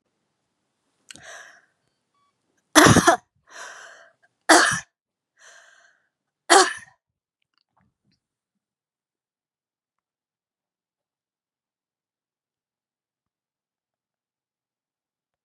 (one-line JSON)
{"three_cough_length": "15.4 s", "three_cough_amplitude": 32768, "three_cough_signal_mean_std_ratio": 0.18, "survey_phase": "beta (2021-08-13 to 2022-03-07)", "age": "45-64", "gender": "Female", "wearing_mask": "No", "symptom_headache": true, "smoker_status": "Never smoked", "respiratory_condition_asthma": false, "respiratory_condition_other": false, "recruitment_source": "Test and Trace", "submission_delay": "2 days", "covid_test_result": "Positive", "covid_test_method": "RT-qPCR", "covid_ct_value": 32.6, "covid_ct_gene": "ORF1ab gene"}